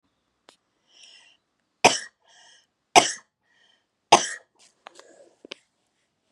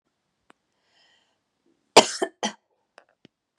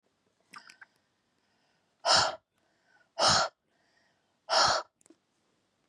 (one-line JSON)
{"three_cough_length": "6.3 s", "three_cough_amplitude": 32752, "three_cough_signal_mean_std_ratio": 0.18, "cough_length": "3.6 s", "cough_amplitude": 32767, "cough_signal_mean_std_ratio": 0.15, "exhalation_length": "5.9 s", "exhalation_amplitude": 9278, "exhalation_signal_mean_std_ratio": 0.32, "survey_phase": "beta (2021-08-13 to 2022-03-07)", "age": "45-64", "gender": "Female", "wearing_mask": "No", "symptom_none": true, "smoker_status": "Never smoked", "respiratory_condition_asthma": false, "respiratory_condition_other": false, "recruitment_source": "REACT", "submission_delay": "1 day", "covid_test_result": "Negative", "covid_test_method": "RT-qPCR", "influenza_a_test_result": "Negative", "influenza_b_test_result": "Negative"}